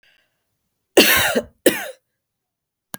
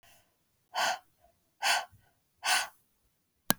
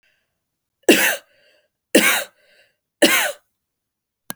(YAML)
cough_length: 3.0 s
cough_amplitude: 32767
cough_signal_mean_std_ratio: 0.33
exhalation_length: 3.6 s
exhalation_amplitude: 32767
exhalation_signal_mean_std_ratio: 0.34
three_cough_length: 4.4 s
three_cough_amplitude: 31287
three_cough_signal_mean_std_ratio: 0.34
survey_phase: alpha (2021-03-01 to 2021-08-12)
age: 18-44
gender: Female
wearing_mask: 'No'
symptom_none: true
smoker_status: Never smoked
respiratory_condition_asthma: false
respiratory_condition_other: false
recruitment_source: REACT
submission_delay: 3 days
covid_test_result: Negative
covid_test_method: RT-qPCR